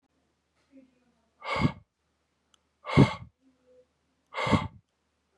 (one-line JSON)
{"exhalation_length": "5.4 s", "exhalation_amplitude": 16672, "exhalation_signal_mean_std_ratio": 0.26, "survey_phase": "beta (2021-08-13 to 2022-03-07)", "age": "18-44", "gender": "Male", "wearing_mask": "No", "symptom_cough_any": true, "symptom_sore_throat": true, "symptom_fatigue": true, "symptom_fever_high_temperature": true, "symptom_headache": true, "smoker_status": "Never smoked", "respiratory_condition_asthma": false, "respiratory_condition_other": false, "recruitment_source": "Test and Trace", "submission_delay": "2 days", "covid_test_result": "Positive", "covid_test_method": "RT-qPCR", "covid_ct_value": 23.4, "covid_ct_gene": "S gene"}